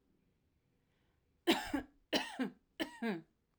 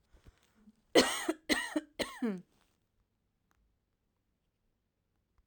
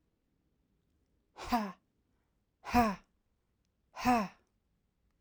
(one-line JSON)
{"three_cough_length": "3.6 s", "three_cough_amplitude": 4578, "three_cough_signal_mean_std_ratio": 0.37, "cough_length": "5.5 s", "cough_amplitude": 10187, "cough_signal_mean_std_ratio": 0.27, "exhalation_length": "5.2 s", "exhalation_amplitude": 6089, "exhalation_signal_mean_std_ratio": 0.29, "survey_phase": "alpha (2021-03-01 to 2021-08-12)", "age": "18-44", "gender": "Female", "wearing_mask": "No", "symptom_change_to_sense_of_smell_or_taste": true, "smoker_status": "Never smoked", "respiratory_condition_asthma": false, "respiratory_condition_other": false, "recruitment_source": "REACT", "submission_delay": "2 days", "covid_test_result": "Negative", "covid_test_method": "RT-qPCR"}